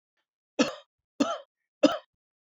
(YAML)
three_cough_length: 2.6 s
three_cough_amplitude: 16676
three_cough_signal_mean_std_ratio: 0.27
survey_phase: beta (2021-08-13 to 2022-03-07)
age: 45-64
gender: Male
wearing_mask: 'No'
symptom_none: true
smoker_status: Never smoked
respiratory_condition_asthma: false
respiratory_condition_other: false
recruitment_source: REACT
submission_delay: 1 day
covid_test_result: Negative
covid_test_method: RT-qPCR